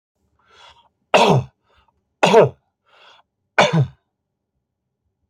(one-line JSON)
{"three_cough_length": "5.3 s", "three_cough_amplitude": 29162, "three_cough_signal_mean_std_ratio": 0.32, "survey_phase": "alpha (2021-03-01 to 2021-08-12)", "age": "45-64", "gender": "Male", "wearing_mask": "No", "symptom_none": true, "smoker_status": "Ex-smoker", "respiratory_condition_asthma": false, "respiratory_condition_other": false, "recruitment_source": "REACT", "submission_delay": "1 day", "covid_test_result": "Negative", "covid_test_method": "RT-qPCR"}